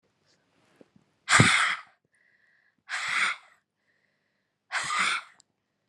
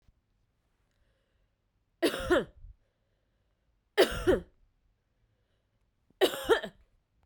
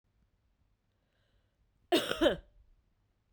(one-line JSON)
{"exhalation_length": "5.9 s", "exhalation_amplitude": 18855, "exhalation_signal_mean_std_ratio": 0.36, "three_cough_length": "7.3 s", "three_cough_amplitude": 10191, "three_cough_signal_mean_std_ratio": 0.28, "cough_length": "3.3 s", "cough_amplitude": 6704, "cough_signal_mean_std_ratio": 0.26, "survey_phase": "beta (2021-08-13 to 2022-03-07)", "age": "18-44", "gender": "Female", "wearing_mask": "No", "symptom_cough_any": true, "symptom_runny_or_blocked_nose": true, "symptom_sore_throat": true, "symptom_abdominal_pain": true, "symptom_fatigue": true, "symptom_fever_high_temperature": true, "symptom_headache": true, "symptom_change_to_sense_of_smell_or_taste": true, "symptom_loss_of_taste": true, "symptom_onset": "2 days", "smoker_status": "Never smoked", "respiratory_condition_asthma": false, "respiratory_condition_other": false, "recruitment_source": "Test and Trace", "submission_delay": "2 days", "covid_test_result": "Positive", "covid_test_method": "RT-qPCR", "covid_ct_value": 16.6, "covid_ct_gene": "ORF1ab gene", "covid_ct_mean": 18.0, "covid_viral_load": "1300000 copies/ml", "covid_viral_load_category": "High viral load (>1M copies/ml)"}